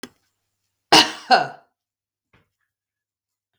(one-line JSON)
{"cough_length": "3.6 s", "cough_amplitude": 32768, "cough_signal_mean_std_ratio": 0.22, "survey_phase": "beta (2021-08-13 to 2022-03-07)", "age": "45-64", "gender": "Female", "wearing_mask": "No", "symptom_none": true, "smoker_status": "Ex-smoker", "respiratory_condition_asthma": false, "respiratory_condition_other": false, "recruitment_source": "REACT", "submission_delay": "1 day", "covid_test_result": "Negative", "covid_test_method": "RT-qPCR"}